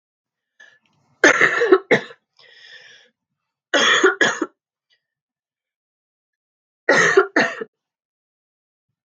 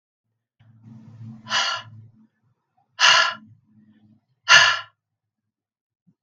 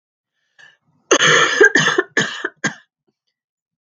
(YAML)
three_cough_length: 9.0 s
three_cough_amplitude: 32768
three_cough_signal_mean_std_ratio: 0.34
exhalation_length: 6.2 s
exhalation_amplitude: 32768
exhalation_signal_mean_std_ratio: 0.29
cough_length: 3.8 s
cough_amplitude: 32768
cough_signal_mean_std_ratio: 0.42
survey_phase: beta (2021-08-13 to 2022-03-07)
age: 18-44
gender: Female
wearing_mask: 'No'
symptom_cough_any: true
symptom_runny_or_blocked_nose: true
symptom_sore_throat: true
symptom_fatigue: true
symptom_fever_high_temperature: true
symptom_headache: true
symptom_change_to_sense_of_smell_or_taste: true
symptom_onset: 2 days
smoker_status: Never smoked
respiratory_condition_asthma: false
respiratory_condition_other: false
recruitment_source: Test and Trace
submission_delay: 1 day
covid_test_result: Positive
covid_test_method: RT-qPCR